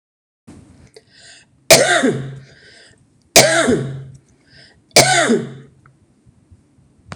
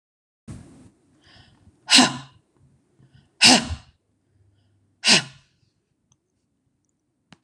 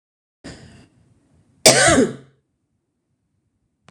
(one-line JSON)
{"three_cough_length": "7.2 s", "three_cough_amplitude": 26028, "three_cough_signal_mean_std_ratio": 0.38, "exhalation_length": "7.4 s", "exhalation_amplitude": 26028, "exhalation_signal_mean_std_ratio": 0.24, "cough_length": "3.9 s", "cough_amplitude": 26028, "cough_signal_mean_std_ratio": 0.28, "survey_phase": "beta (2021-08-13 to 2022-03-07)", "age": "45-64", "gender": "Female", "wearing_mask": "No", "symptom_none": true, "smoker_status": "Never smoked", "respiratory_condition_asthma": false, "respiratory_condition_other": false, "recruitment_source": "REACT", "submission_delay": "1 day", "covid_test_result": "Negative", "covid_test_method": "RT-qPCR"}